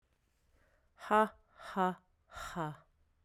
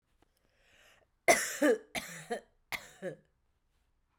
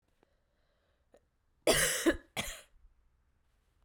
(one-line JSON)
{"exhalation_length": "3.2 s", "exhalation_amplitude": 5220, "exhalation_signal_mean_std_ratio": 0.34, "three_cough_length": "4.2 s", "three_cough_amplitude": 11001, "three_cough_signal_mean_std_ratio": 0.3, "cough_length": "3.8 s", "cough_amplitude": 7654, "cough_signal_mean_std_ratio": 0.31, "survey_phase": "beta (2021-08-13 to 2022-03-07)", "age": "45-64", "gender": "Female", "wearing_mask": "No", "symptom_runny_or_blocked_nose": true, "symptom_fatigue": true, "symptom_headache": true, "smoker_status": "Never smoked", "respiratory_condition_asthma": false, "respiratory_condition_other": false, "recruitment_source": "Test and Trace", "submission_delay": "1 day", "covid_test_result": "Positive", "covid_test_method": "RT-qPCR"}